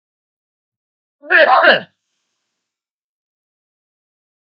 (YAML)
cough_length: 4.4 s
cough_amplitude: 32768
cough_signal_mean_std_ratio: 0.27
survey_phase: beta (2021-08-13 to 2022-03-07)
age: 65+
gender: Male
wearing_mask: 'No'
symptom_none: true
symptom_onset: 12 days
smoker_status: Ex-smoker
respiratory_condition_asthma: false
respiratory_condition_other: false
recruitment_source: REACT
submission_delay: 2 days
covid_test_result: Negative
covid_test_method: RT-qPCR
influenza_a_test_result: Negative
influenza_b_test_result: Negative